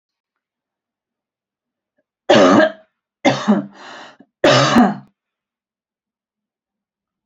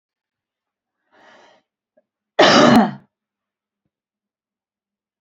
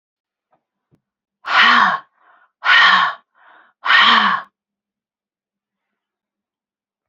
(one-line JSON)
{"three_cough_length": "7.3 s", "three_cough_amplitude": 29625, "three_cough_signal_mean_std_ratio": 0.34, "cough_length": "5.2 s", "cough_amplitude": 29127, "cough_signal_mean_std_ratio": 0.26, "exhalation_length": "7.1 s", "exhalation_amplitude": 30295, "exhalation_signal_mean_std_ratio": 0.38, "survey_phase": "beta (2021-08-13 to 2022-03-07)", "age": "45-64", "gender": "Female", "wearing_mask": "No", "symptom_none": true, "smoker_status": "Ex-smoker", "respiratory_condition_asthma": false, "respiratory_condition_other": false, "recruitment_source": "REACT", "submission_delay": "1 day", "covid_test_result": "Negative", "covid_test_method": "RT-qPCR", "influenza_a_test_result": "Negative", "influenza_b_test_result": "Negative"}